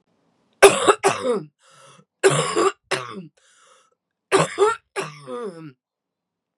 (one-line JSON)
{"three_cough_length": "6.6 s", "three_cough_amplitude": 32768, "three_cough_signal_mean_std_ratio": 0.38, "survey_phase": "beta (2021-08-13 to 2022-03-07)", "age": "45-64", "gender": "Female", "wearing_mask": "No", "symptom_cough_any": true, "symptom_runny_or_blocked_nose": true, "symptom_shortness_of_breath": true, "symptom_fatigue": true, "symptom_fever_high_temperature": true, "symptom_headache": true, "symptom_change_to_sense_of_smell_or_taste": true, "smoker_status": "Ex-smoker", "respiratory_condition_asthma": false, "respiratory_condition_other": false, "recruitment_source": "Test and Trace", "submission_delay": "2 days", "covid_test_result": "Positive", "covid_test_method": "LFT"}